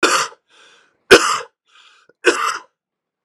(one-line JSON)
{"three_cough_length": "3.2 s", "three_cough_amplitude": 32768, "three_cough_signal_mean_std_ratio": 0.35, "survey_phase": "beta (2021-08-13 to 2022-03-07)", "age": "18-44", "gender": "Male", "wearing_mask": "No", "symptom_runny_or_blocked_nose": true, "smoker_status": "Never smoked", "respiratory_condition_asthma": false, "respiratory_condition_other": false, "recruitment_source": "REACT", "submission_delay": "1 day", "covid_test_result": "Negative", "covid_test_method": "RT-qPCR", "influenza_a_test_result": "Negative", "influenza_b_test_result": "Negative"}